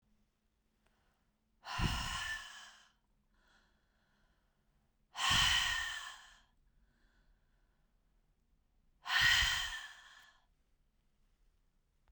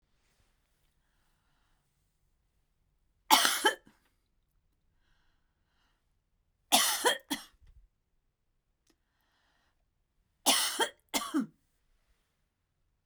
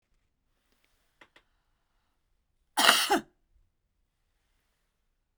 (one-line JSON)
{"exhalation_length": "12.1 s", "exhalation_amplitude": 4295, "exhalation_signal_mean_std_ratio": 0.35, "three_cough_length": "13.1 s", "three_cough_amplitude": 15865, "three_cough_signal_mean_std_ratio": 0.25, "cough_length": "5.4 s", "cough_amplitude": 27753, "cough_signal_mean_std_ratio": 0.21, "survey_phase": "beta (2021-08-13 to 2022-03-07)", "age": "65+", "gender": "Female", "wearing_mask": "No", "symptom_cough_any": true, "symptom_onset": "7 days", "smoker_status": "Never smoked", "respiratory_condition_asthma": false, "respiratory_condition_other": false, "recruitment_source": "REACT", "submission_delay": "0 days", "covid_test_result": "Negative", "covid_test_method": "RT-qPCR", "influenza_a_test_result": "Negative", "influenza_b_test_result": "Negative"}